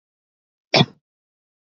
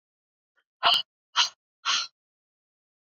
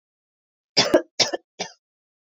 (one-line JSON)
{"cough_length": "1.7 s", "cough_amplitude": 27124, "cough_signal_mean_std_ratio": 0.19, "exhalation_length": "3.1 s", "exhalation_amplitude": 14831, "exhalation_signal_mean_std_ratio": 0.31, "three_cough_length": "2.3 s", "three_cough_amplitude": 24070, "three_cough_signal_mean_std_ratio": 0.29, "survey_phase": "beta (2021-08-13 to 2022-03-07)", "age": "18-44", "gender": "Female", "wearing_mask": "No", "symptom_new_continuous_cough": true, "symptom_runny_or_blocked_nose": true, "symptom_shortness_of_breath": true, "symptom_fatigue": true, "symptom_headache": true, "smoker_status": "Current smoker (e-cigarettes or vapes only)", "respiratory_condition_asthma": false, "respiratory_condition_other": false, "recruitment_source": "Test and Trace", "submission_delay": "2 days", "covid_test_result": "Positive", "covid_test_method": "RT-qPCR", "covid_ct_value": 33.7, "covid_ct_gene": "S gene", "covid_ct_mean": 34.0, "covid_viral_load": "7.1 copies/ml", "covid_viral_load_category": "Minimal viral load (< 10K copies/ml)"}